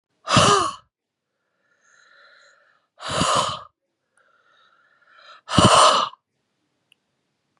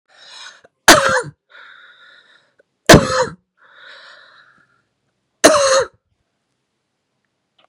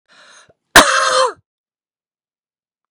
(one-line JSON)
{"exhalation_length": "7.6 s", "exhalation_amplitude": 30980, "exhalation_signal_mean_std_ratio": 0.34, "three_cough_length": "7.7 s", "three_cough_amplitude": 32768, "three_cough_signal_mean_std_ratio": 0.29, "cough_length": "2.9 s", "cough_amplitude": 32768, "cough_signal_mean_std_ratio": 0.32, "survey_phase": "beta (2021-08-13 to 2022-03-07)", "age": "45-64", "gender": "Female", "wearing_mask": "No", "symptom_fatigue": true, "symptom_headache": true, "smoker_status": "Current smoker (11 or more cigarettes per day)", "respiratory_condition_asthma": false, "respiratory_condition_other": false, "recruitment_source": "Test and Trace", "submission_delay": "1 day", "covid_test_result": "Positive", "covid_test_method": "LFT"}